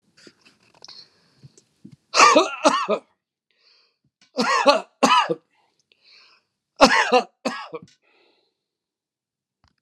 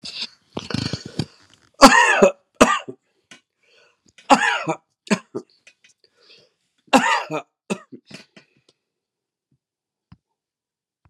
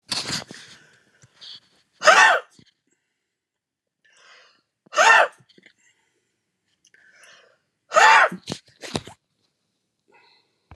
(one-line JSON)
{"cough_length": "9.8 s", "cough_amplitude": 32767, "cough_signal_mean_std_ratio": 0.33, "three_cough_length": "11.1 s", "three_cough_amplitude": 32768, "three_cough_signal_mean_std_ratio": 0.28, "exhalation_length": "10.8 s", "exhalation_amplitude": 30422, "exhalation_signal_mean_std_ratio": 0.28, "survey_phase": "alpha (2021-03-01 to 2021-08-12)", "age": "65+", "gender": "Male", "wearing_mask": "No", "symptom_none": true, "smoker_status": "Prefer not to say", "respiratory_condition_asthma": true, "respiratory_condition_other": false, "recruitment_source": "REACT", "submission_delay": "1 day", "covid_test_result": "Negative", "covid_test_method": "RT-qPCR"}